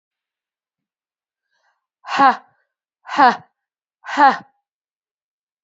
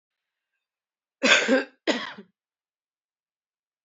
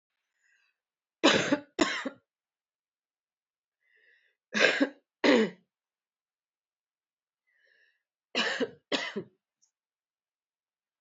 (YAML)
exhalation_length: 5.6 s
exhalation_amplitude: 28138
exhalation_signal_mean_std_ratio: 0.26
cough_length: 3.8 s
cough_amplitude: 26346
cough_signal_mean_std_ratio: 0.29
three_cough_length: 11.0 s
three_cough_amplitude: 16436
three_cough_signal_mean_std_ratio: 0.29
survey_phase: beta (2021-08-13 to 2022-03-07)
age: 18-44
gender: Female
wearing_mask: 'No'
symptom_cough_any: true
symptom_runny_or_blocked_nose: true
symptom_sore_throat: true
symptom_headache: true
symptom_change_to_sense_of_smell_or_taste: true
symptom_loss_of_taste: true
symptom_onset: 5 days
smoker_status: Ex-smoker
respiratory_condition_asthma: false
respiratory_condition_other: false
recruitment_source: Test and Trace
submission_delay: 1 day
covid_test_result: Positive
covid_test_method: RT-qPCR
covid_ct_value: 21.7
covid_ct_gene: ORF1ab gene
covid_ct_mean: 22.1
covid_viral_load: 57000 copies/ml
covid_viral_load_category: Low viral load (10K-1M copies/ml)